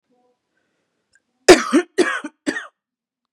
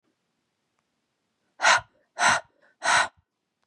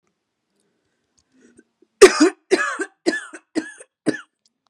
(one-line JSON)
{"cough_length": "3.3 s", "cough_amplitude": 32768, "cough_signal_mean_std_ratio": 0.27, "exhalation_length": "3.7 s", "exhalation_amplitude": 14872, "exhalation_signal_mean_std_ratio": 0.33, "three_cough_length": "4.7 s", "three_cough_amplitude": 32768, "three_cough_signal_mean_std_ratio": 0.26, "survey_phase": "beta (2021-08-13 to 2022-03-07)", "age": "18-44", "gender": "Female", "wearing_mask": "No", "symptom_cough_any": true, "symptom_onset": "11 days", "smoker_status": "Ex-smoker", "respiratory_condition_asthma": false, "respiratory_condition_other": false, "recruitment_source": "REACT", "submission_delay": "1 day", "covid_test_result": "Negative", "covid_test_method": "RT-qPCR", "influenza_a_test_result": "Negative", "influenza_b_test_result": "Negative"}